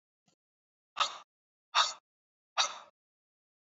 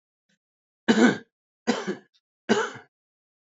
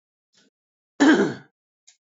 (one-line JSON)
{"exhalation_length": "3.8 s", "exhalation_amplitude": 7868, "exhalation_signal_mean_std_ratio": 0.25, "three_cough_length": "3.5 s", "three_cough_amplitude": 17139, "three_cough_signal_mean_std_ratio": 0.33, "cough_length": "2.0 s", "cough_amplitude": 21037, "cough_signal_mean_std_ratio": 0.32, "survey_phase": "beta (2021-08-13 to 2022-03-07)", "age": "18-44", "gender": "Male", "wearing_mask": "No", "symptom_none": true, "smoker_status": "Never smoked", "respiratory_condition_asthma": true, "respiratory_condition_other": false, "recruitment_source": "REACT", "submission_delay": "2 days", "covid_test_result": "Negative", "covid_test_method": "RT-qPCR", "influenza_a_test_result": "Negative", "influenza_b_test_result": "Negative"}